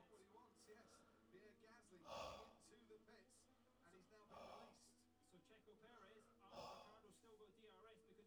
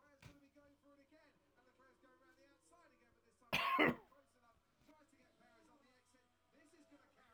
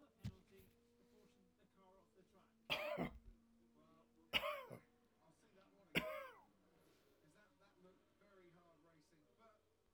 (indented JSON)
{
  "exhalation_length": "8.3 s",
  "exhalation_amplitude": 224,
  "exhalation_signal_mean_std_ratio": 0.72,
  "cough_length": "7.3 s",
  "cough_amplitude": 2966,
  "cough_signal_mean_std_ratio": 0.24,
  "three_cough_length": "9.9 s",
  "three_cough_amplitude": 2095,
  "three_cough_signal_mean_std_ratio": 0.32,
  "survey_phase": "alpha (2021-03-01 to 2021-08-12)",
  "age": "45-64",
  "gender": "Male",
  "wearing_mask": "No",
  "symptom_abdominal_pain": true,
  "symptom_fatigue": true,
  "symptom_headache": true,
  "symptom_onset": "12 days",
  "smoker_status": "Never smoked",
  "respiratory_condition_asthma": false,
  "respiratory_condition_other": false,
  "recruitment_source": "REACT",
  "submission_delay": "33 days",
  "covid_test_result": "Negative",
  "covid_test_method": "RT-qPCR"
}